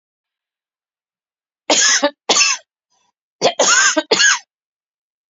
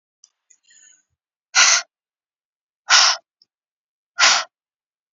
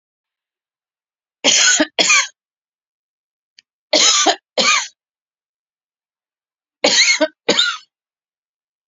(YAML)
cough_length: 5.3 s
cough_amplitude: 31256
cough_signal_mean_std_ratio: 0.43
exhalation_length: 5.1 s
exhalation_amplitude: 32767
exhalation_signal_mean_std_ratio: 0.3
three_cough_length: 8.9 s
three_cough_amplitude: 32768
three_cough_signal_mean_std_ratio: 0.39
survey_phase: beta (2021-08-13 to 2022-03-07)
age: 45-64
gender: Female
wearing_mask: 'No'
symptom_shortness_of_breath: true
symptom_abdominal_pain: true
symptom_fatigue: true
symptom_onset: 12 days
smoker_status: Current smoker (e-cigarettes or vapes only)
respiratory_condition_asthma: false
respiratory_condition_other: false
recruitment_source: REACT
submission_delay: 1 day
covid_test_result: Negative
covid_test_method: RT-qPCR